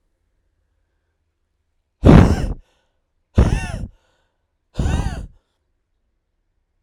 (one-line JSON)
{"exhalation_length": "6.8 s", "exhalation_amplitude": 32768, "exhalation_signal_mean_std_ratio": 0.28, "survey_phase": "beta (2021-08-13 to 2022-03-07)", "age": "18-44", "gender": "Male", "wearing_mask": "No", "symptom_fatigue": true, "symptom_headache": true, "symptom_change_to_sense_of_smell_or_taste": true, "symptom_loss_of_taste": true, "symptom_onset": "6 days", "smoker_status": "Never smoked", "respiratory_condition_asthma": false, "respiratory_condition_other": false, "recruitment_source": "Test and Trace", "submission_delay": "3 days", "covid_test_result": "Positive", "covid_test_method": "RT-qPCR", "covid_ct_value": 17.0, "covid_ct_gene": "ORF1ab gene", "covid_ct_mean": 17.5, "covid_viral_load": "1800000 copies/ml", "covid_viral_load_category": "High viral load (>1M copies/ml)"}